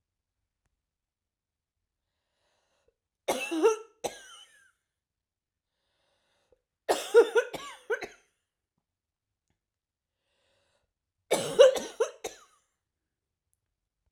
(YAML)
three_cough_length: 14.1 s
three_cough_amplitude: 17439
three_cough_signal_mean_std_ratio: 0.23
survey_phase: beta (2021-08-13 to 2022-03-07)
age: 45-64
gender: Female
wearing_mask: 'No'
symptom_cough_any: true
symptom_runny_or_blocked_nose: true
symptom_fatigue: true
symptom_fever_high_temperature: true
symptom_headache: true
symptom_change_to_sense_of_smell_or_taste: true
symptom_loss_of_taste: true
symptom_onset: 3 days
smoker_status: Never smoked
respiratory_condition_asthma: false
respiratory_condition_other: false
recruitment_source: Test and Trace
submission_delay: 2 days
covid_test_result: Positive
covid_test_method: RT-qPCR
covid_ct_value: 21.1
covid_ct_gene: N gene